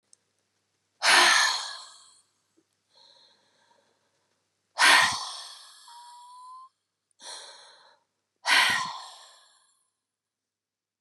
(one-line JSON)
{"exhalation_length": "11.0 s", "exhalation_amplitude": 20773, "exhalation_signal_mean_std_ratio": 0.31, "survey_phase": "beta (2021-08-13 to 2022-03-07)", "age": "45-64", "gender": "Female", "wearing_mask": "No", "symptom_none": true, "symptom_onset": "12 days", "smoker_status": "Ex-smoker", "respiratory_condition_asthma": false, "respiratory_condition_other": false, "recruitment_source": "REACT", "submission_delay": "4 days", "covid_test_result": "Negative", "covid_test_method": "RT-qPCR", "influenza_a_test_result": "Negative", "influenza_b_test_result": "Negative"}